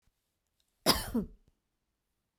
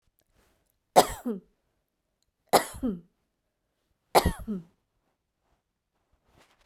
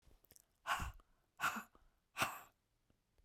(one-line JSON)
{"cough_length": "2.4 s", "cough_amplitude": 10401, "cough_signal_mean_std_ratio": 0.27, "three_cough_length": "6.7 s", "three_cough_amplitude": 24219, "three_cough_signal_mean_std_ratio": 0.22, "exhalation_length": "3.2 s", "exhalation_amplitude": 2323, "exhalation_signal_mean_std_ratio": 0.36, "survey_phase": "beta (2021-08-13 to 2022-03-07)", "age": "45-64", "gender": "Female", "wearing_mask": "No", "symptom_none": true, "smoker_status": "Never smoked", "respiratory_condition_asthma": false, "respiratory_condition_other": false, "recruitment_source": "REACT", "submission_delay": "3 days", "covid_test_result": "Negative", "covid_test_method": "RT-qPCR"}